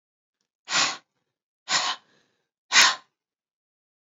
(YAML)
exhalation_length: 4.1 s
exhalation_amplitude: 22702
exhalation_signal_mean_std_ratio: 0.3
survey_phase: beta (2021-08-13 to 2022-03-07)
age: 18-44
gender: Female
wearing_mask: 'No'
symptom_cough_any: true
symptom_sore_throat: true
smoker_status: Never smoked
respiratory_condition_asthma: false
respiratory_condition_other: false
recruitment_source: Test and Trace
submission_delay: 2 days
covid_test_result: Positive
covid_test_method: ePCR